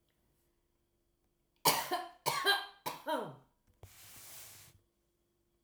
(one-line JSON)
{"three_cough_length": "5.6 s", "three_cough_amplitude": 7464, "three_cough_signal_mean_std_ratio": 0.35, "survey_phase": "alpha (2021-03-01 to 2021-08-12)", "age": "45-64", "gender": "Female", "wearing_mask": "No", "symptom_none": true, "smoker_status": "Never smoked", "respiratory_condition_asthma": false, "respiratory_condition_other": false, "recruitment_source": "REACT", "submission_delay": "3 days", "covid_test_result": "Negative", "covid_test_method": "RT-qPCR"}